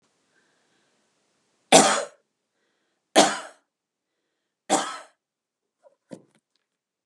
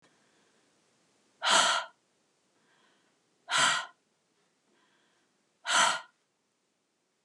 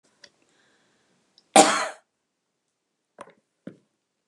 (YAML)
three_cough_length: 7.1 s
three_cough_amplitude: 32742
three_cough_signal_mean_std_ratio: 0.22
exhalation_length: 7.2 s
exhalation_amplitude: 9845
exhalation_signal_mean_std_ratio: 0.31
cough_length: 4.3 s
cough_amplitude: 32364
cough_signal_mean_std_ratio: 0.19
survey_phase: beta (2021-08-13 to 2022-03-07)
age: 65+
gender: Female
wearing_mask: 'No'
symptom_none: true
symptom_onset: 8 days
smoker_status: Current smoker (11 or more cigarettes per day)
respiratory_condition_asthma: false
respiratory_condition_other: false
recruitment_source: REACT
submission_delay: 14 days
covid_test_result: Negative
covid_test_method: RT-qPCR
influenza_a_test_result: Negative
influenza_b_test_result: Negative